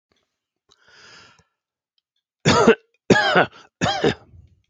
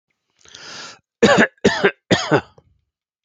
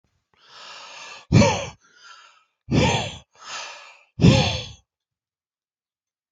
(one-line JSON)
{"three_cough_length": "4.7 s", "three_cough_amplitude": 28736, "three_cough_signal_mean_std_ratio": 0.35, "cough_length": "3.2 s", "cough_amplitude": 27561, "cough_signal_mean_std_ratio": 0.38, "exhalation_length": "6.3 s", "exhalation_amplitude": 26569, "exhalation_signal_mean_std_ratio": 0.35, "survey_phase": "alpha (2021-03-01 to 2021-08-12)", "age": "45-64", "gender": "Male", "wearing_mask": "No", "symptom_none": true, "smoker_status": "Ex-smoker", "respiratory_condition_asthma": false, "respiratory_condition_other": false, "recruitment_source": "REACT", "submission_delay": "2 days", "covid_test_result": "Negative", "covid_test_method": "RT-qPCR"}